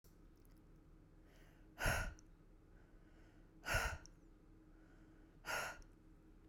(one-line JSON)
{"exhalation_length": "6.5 s", "exhalation_amplitude": 2094, "exhalation_signal_mean_std_ratio": 0.43, "survey_phase": "beta (2021-08-13 to 2022-03-07)", "age": "45-64", "gender": "Female", "wearing_mask": "No", "symptom_none": true, "smoker_status": "Ex-smoker", "respiratory_condition_asthma": false, "respiratory_condition_other": false, "recruitment_source": "REACT", "submission_delay": "1 day", "covid_test_result": "Negative", "covid_test_method": "RT-qPCR", "influenza_a_test_result": "Negative", "influenza_b_test_result": "Negative"}